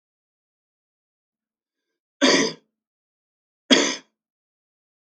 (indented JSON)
{
  "three_cough_length": "5.0 s",
  "three_cough_amplitude": 32768,
  "three_cough_signal_mean_std_ratio": 0.24,
  "survey_phase": "beta (2021-08-13 to 2022-03-07)",
  "age": "45-64",
  "gender": "Male",
  "wearing_mask": "No",
  "symptom_cough_any": true,
  "symptom_runny_or_blocked_nose": true,
  "symptom_onset": "8 days",
  "smoker_status": "Never smoked",
  "respiratory_condition_asthma": false,
  "respiratory_condition_other": false,
  "recruitment_source": "REACT",
  "submission_delay": "1 day",
  "covid_test_result": "Negative",
  "covid_test_method": "RT-qPCR",
  "influenza_a_test_result": "Negative",
  "influenza_b_test_result": "Negative"
}